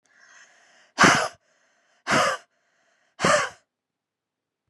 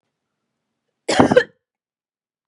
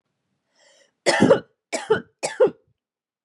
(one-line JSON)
{"exhalation_length": "4.7 s", "exhalation_amplitude": 27728, "exhalation_signal_mean_std_ratio": 0.33, "cough_length": "2.5 s", "cough_amplitude": 32768, "cough_signal_mean_std_ratio": 0.25, "three_cough_length": "3.2 s", "three_cough_amplitude": 24433, "three_cough_signal_mean_std_ratio": 0.34, "survey_phase": "beta (2021-08-13 to 2022-03-07)", "age": "18-44", "gender": "Female", "wearing_mask": "No", "symptom_none": true, "smoker_status": "Never smoked", "respiratory_condition_asthma": true, "respiratory_condition_other": false, "recruitment_source": "REACT", "submission_delay": "1 day", "covid_test_result": "Negative", "covid_test_method": "RT-qPCR", "influenza_a_test_result": "Unknown/Void", "influenza_b_test_result": "Unknown/Void"}